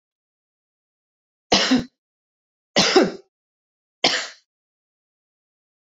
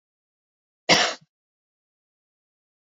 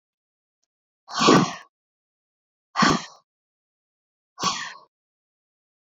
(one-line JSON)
{"three_cough_length": "6.0 s", "three_cough_amplitude": 26748, "three_cough_signal_mean_std_ratio": 0.29, "cough_length": "2.9 s", "cough_amplitude": 24523, "cough_signal_mean_std_ratio": 0.21, "exhalation_length": "5.9 s", "exhalation_amplitude": 25140, "exhalation_signal_mean_std_ratio": 0.28, "survey_phase": "beta (2021-08-13 to 2022-03-07)", "age": "18-44", "gender": "Female", "wearing_mask": "No", "symptom_none": true, "symptom_onset": "6 days", "smoker_status": "Never smoked", "respiratory_condition_asthma": false, "respiratory_condition_other": false, "recruitment_source": "REACT", "submission_delay": "2 days", "covid_test_result": "Negative", "covid_test_method": "RT-qPCR"}